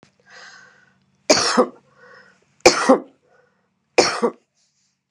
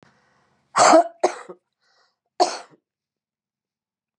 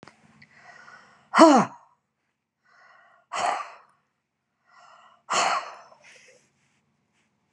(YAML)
three_cough_length: 5.1 s
three_cough_amplitude: 32768
three_cough_signal_mean_std_ratio: 0.32
cough_length: 4.2 s
cough_amplitude: 29205
cough_signal_mean_std_ratio: 0.27
exhalation_length: 7.5 s
exhalation_amplitude: 29851
exhalation_signal_mean_std_ratio: 0.25
survey_phase: beta (2021-08-13 to 2022-03-07)
age: 65+
gender: Female
wearing_mask: 'No'
symptom_cough_any: true
smoker_status: Never smoked
respiratory_condition_asthma: false
respiratory_condition_other: true
recruitment_source: REACT
submission_delay: 5 days
covid_test_result: Negative
covid_test_method: RT-qPCR